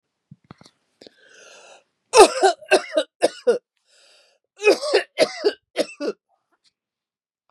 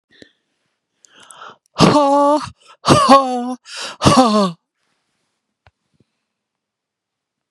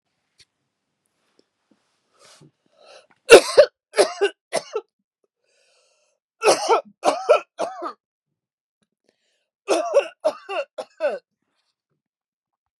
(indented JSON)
{
  "cough_length": "7.5 s",
  "cough_amplitude": 32767,
  "cough_signal_mean_std_ratio": 0.31,
  "exhalation_length": "7.5 s",
  "exhalation_amplitude": 32768,
  "exhalation_signal_mean_std_ratio": 0.39,
  "three_cough_length": "12.8 s",
  "three_cough_amplitude": 32768,
  "three_cough_signal_mean_std_ratio": 0.26,
  "survey_phase": "beta (2021-08-13 to 2022-03-07)",
  "age": "45-64",
  "gender": "Female",
  "wearing_mask": "No",
  "symptom_none": true,
  "smoker_status": "Never smoked",
  "respiratory_condition_asthma": false,
  "respiratory_condition_other": false,
  "recruitment_source": "REACT",
  "submission_delay": "3 days",
  "covid_test_result": "Negative",
  "covid_test_method": "RT-qPCR",
  "influenza_a_test_result": "Unknown/Void",
  "influenza_b_test_result": "Unknown/Void"
}